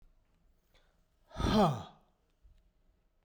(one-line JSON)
{"exhalation_length": "3.2 s", "exhalation_amplitude": 4901, "exhalation_signal_mean_std_ratio": 0.3, "survey_phase": "beta (2021-08-13 to 2022-03-07)", "age": "45-64", "gender": "Male", "wearing_mask": "No", "symptom_none": true, "smoker_status": "Ex-smoker", "respiratory_condition_asthma": true, "respiratory_condition_other": false, "recruitment_source": "REACT", "submission_delay": "1 day", "covid_test_result": "Negative", "covid_test_method": "RT-qPCR"}